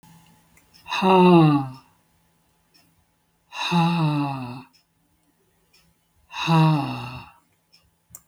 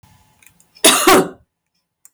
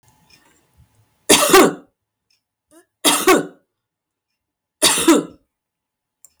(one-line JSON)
{"exhalation_length": "8.3 s", "exhalation_amplitude": 19094, "exhalation_signal_mean_std_ratio": 0.42, "cough_length": "2.1 s", "cough_amplitude": 32768, "cough_signal_mean_std_ratio": 0.37, "three_cough_length": "6.4 s", "three_cough_amplitude": 32768, "three_cough_signal_mean_std_ratio": 0.34, "survey_phase": "beta (2021-08-13 to 2022-03-07)", "age": "65+", "gender": "Female", "wearing_mask": "No", "symptom_none": true, "smoker_status": "Never smoked", "respiratory_condition_asthma": false, "respiratory_condition_other": false, "recruitment_source": "REACT", "submission_delay": "13 days", "covid_test_result": "Negative", "covid_test_method": "RT-qPCR", "influenza_a_test_result": "Unknown/Void", "influenza_b_test_result": "Unknown/Void"}